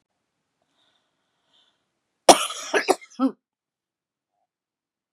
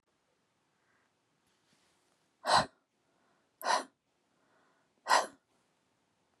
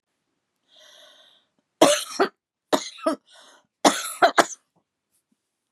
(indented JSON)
{
  "cough_length": "5.1 s",
  "cough_amplitude": 32768,
  "cough_signal_mean_std_ratio": 0.19,
  "exhalation_length": "6.4 s",
  "exhalation_amplitude": 8258,
  "exhalation_signal_mean_std_ratio": 0.23,
  "three_cough_length": "5.7 s",
  "three_cough_amplitude": 31150,
  "three_cough_signal_mean_std_ratio": 0.28,
  "survey_phase": "beta (2021-08-13 to 2022-03-07)",
  "age": "45-64",
  "gender": "Female",
  "wearing_mask": "No",
  "symptom_cough_any": true,
  "symptom_runny_or_blocked_nose": true,
  "symptom_fatigue": true,
  "symptom_headache": true,
  "smoker_status": "Never smoked",
  "respiratory_condition_asthma": true,
  "respiratory_condition_other": false,
  "recruitment_source": "REACT",
  "submission_delay": "0 days",
  "covid_test_result": "Negative",
  "covid_test_method": "RT-qPCR",
  "influenza_a_test_result": "Negative",
  "influenza_b_test_result": "Negative"
}